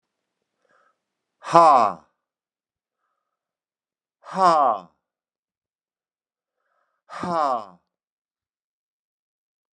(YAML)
exhalation_length: 9.7 s
exhalation_amplitude: 32740
exhalation_signal_mean_std_ratio: 0.24
survey_phase: beta (2021-08-13 to 2022-03-07)
age: 65+
gender: Male
wearing_mask: 'No'
symptom_none: true
smoker_status: Never smoked
respiratory_condition_asthma: false
respiratory_condition_other: false
recruitment_source: REACT
submission_delay: 1 day
covid_test_result: Negative
covid_test_method: RT-qPCR